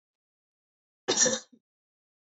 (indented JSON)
{
  "cough_length": "2.4 s",
  "cough_amplitude": 11913,
  "cough_signal_mean_std_ratio": 0.27,
  "survey_phase": "beta (2021-08-13 to 2022-03-07)",
  "age": "18-44",
  "gender": "Female",
  "wearing_mask": "No",
  "symptom_cough_any": true,
  "symptom_sore_throat": true,
  "smoker_status": "Never smoked",
  "respiratory_condition_asthma": false,
  "respiratory_condition_other": false,
  "recruitment_source": "Test and Trace",
  "submission_delay": "0 days",
  "covid_test_result": "Negative",
  "covid_test_method": "LFT"
}